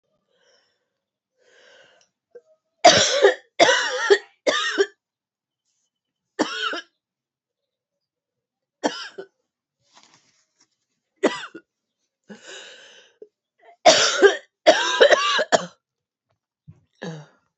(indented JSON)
{
  "cough_length": "17.6 s",
  "cough_amplitude": 31899,
  "cough_signal_mean_std_ratio": 0.31,
  "survey_phase": "alpha (2021-03-01 to 2021-08-12)",
  "age": "18-44",
  "gender": "Female",
  "wearing_mask": "No",
  "symptom_cough_any": true,
  "symptom_new_continuous_cough": true,
  "symptom_shortness_of_breath": true,
  "symptom_abdominal_pain": true,
  "symptom_fatigue": true,
  "symptom_fever_high_temperature": true,
  "symptom_headache": true,
  "symptom_change_to_sense_of_smell_or_taste": true,
  "symptom_loss_of_taste": true,
  "symptom_onset": "3 days",
  "smoker_status": "Never smoked",
  "respiratory_condition_asthma": false,
  "respiratory_condition_other": false,
  "recruitment_source": "Test and Trace",
  "submission_delay": "1 day",
  "covid_test_result": "Positive",
  "covid_test_method": "RT-qPCR",
  "covid_ct_value": 17.9,
  "covid_ct_gene": "N gene",
  "covid_ct_mean": 18.6,
  "covid_viral_load": "790000 copies/ml",
  "covid_viral_load_category": "Low viral load (10K-1M copies/ml)"
}